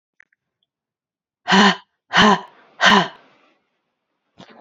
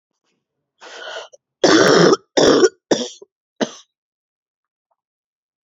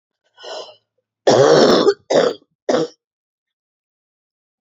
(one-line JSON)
{"exhalation_length": "4.6 s", "exhalation_amplitude": 29480, "exhalation_signal_mean_std_ratio": 0.33, "cough_length": "5.6 s", "cough_amplitude": 31159, "cough_signal_mean_std_ratio": 0.36, "three_cough_length": "4.6 s", "three_cough_amplitude": 32767, "three_cough_signal_mean_std_ratio": 0.4, "survey_phase": "alpha (2021-03-01 to 2021-08-12)", "age": "45-64", "gender": "Female", "wearing_mask": "No", "symptom_cough_any": true, "symptom_new_continuous_cough": true, "symptom_fatigue": true, "symptom_headache": true, "symptom_change_to_sense_of_smell_or_taste": true, "symptom_loss_of_taste": true, "symptom_onset": "3 days", "smoker_status": "Never smoked", "respiratory_condition_asthma": false, "respiratory_condition_other": false, "recruitment_source": "Test and Trace", "submission_delay": "2 days", "covid_test_result": "Positive", "covid_test_method": "RT-qPCR"}